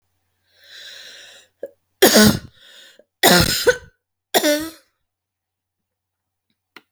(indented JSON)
{
  "three_cough_length": "6.9 s",
  "three_cough_amplitude": 32768,
  "three_cough_signal_mean_std_ratio": 0.32,
  "survey_phase": "beta (2021-08-13 to 2022-03-07)",
  "age": "45-64",
  "gender": "Female",
  "wearing_mask": "No",
  "symptom_cough_any": true,
  "symptom_sore_throat": true,
  "symptom_fever_high_temperature": true,
  "symptom_onset": "12 days",
  "smoker_status": "Never smoked",
  "respiratory_condition_asthma": false,
  "respiratory_condition_other": false,
  "recruitment_source": "REACT",
  "submission_delay": "1 day",
  "covid_test_result": "Negative",
  "covid_test_method": "RT-qPCR"
}